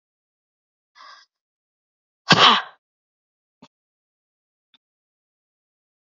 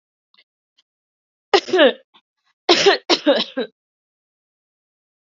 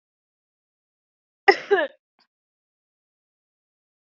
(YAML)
exhalation_length: 6.1 s
exhalation_amplitude: 30162
exhalation_signal_mean_std_ratio: 0.17
three_cough_length: 5.3 s
three_cough_amplitude: 29952
three_cough_signal_mean_std_ratio: 0.32
cough_length: 4.1 s
cough_amplitude: 27042
cough_signal_mean_std_ratio: 0.17
survey_phase: beta (2021-08-13 to 2022-03-07)
age: 18-44
gender: Female
wearing_mask: 'No'
symptom_sore_throat: true
smoker_status: Never smoked
respiratory_condition_asthma: false
respiratory_condition_other: false
recruitment_source: Test and Trace
submission_delay: 1 day
covid_test_result: Negative
covid_test_method: RT-qPCR